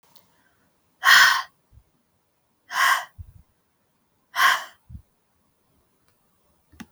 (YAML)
exhalation_length: 6.9 s
exhalation_amplitude: 32231
exhalation_signal_mean_std_ratio: 0.28
survey_phase: beta (2021-08-13 to 2022-03-07)
age: 18-44
gender: Female
wearing_mask: 'No'
symptom_cough_any: true
symptom_shortness_of_breath: true
symptom_fatigue: true
symptom_fever_high_temperature: true
symptom_headache: true
symptom_other: true
symptom_onset: 2 days
smoker_status: Never smoked
respiratory_condition_asthma: true
respiratory_condition_other: false
recruitment_source: Test and Trace
submission_delay: 2 days
covid_test_result: Positive
covid_test_method: ePCR